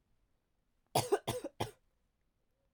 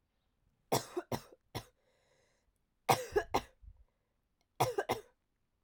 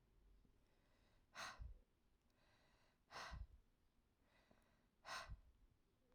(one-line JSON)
{"cough_length": "2.7 s", "cough_amplitude": 4356, "cough_signal_mean_std_ratio": 0.28, "three_cough_length": "5.6 s", "three_cough_amplitude": 8358, "three_cough_signal_mean_std_ratio": 0.29, "exhalation_length": "6.1 s", "exhalation_amplitude": 332, "exhalation_signal_mean_std_ratio": 0.46, "survey_phase": "alpha (2021-03-01 to 2021-08-12)", "age": "18-44", "gender": "Female", "wearing_mask": "No", "symptom_cough_any": true, "symptom_shortness_of_breath": true, "symptom_diarrhoea": true, "symptom_fatigue": true, "symptom_fever_high_temperature": true, "symptom_change_to_sense_of_smell_or_taste": true, "symptom_loss_of_taste": true, "symptom_onset": "3 days", "smoker_status": "Never smoked", "respiratory_condition_asthma": false, "respiratory_condition_other": false, "recruitment_source": "Test and Trace", "submission_delay": "2 days", "covid_test_result": "Positive", "covid_test_method": "RT-qPCR", "covid_ct_value": 17.9, "covid_ct_gene": "N gene", "covid_ct_mean": 18.4, "covid_viral_load": "950000 copies/ml", "covid_viral_load_category": "Low viral load (10K-1M copies/ml)"}